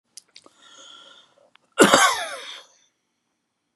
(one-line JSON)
{"cough_length": "3.8 s", "cough_amplitude": 32767, "cough_signal_mean_std_ratio": 0.28, "survey_phase": "beta (2021-08-13 to 2022-03-07)", "age": "65+", "gender": "Male", "wearing_mask": "No", "symptom_cough_any": true, "smoker_status": "Never smoked", "respiratory_condition_asthma": false, "respiratory_condition_other": false, "recruitment_source": "REACT", "submission_delay": "2 days", "covid_test_result": "Negative", "covid_test_method": "RT-qPCR", "influenza_a_test_result": "Negative", "influenza_b_test_result": "Negative"}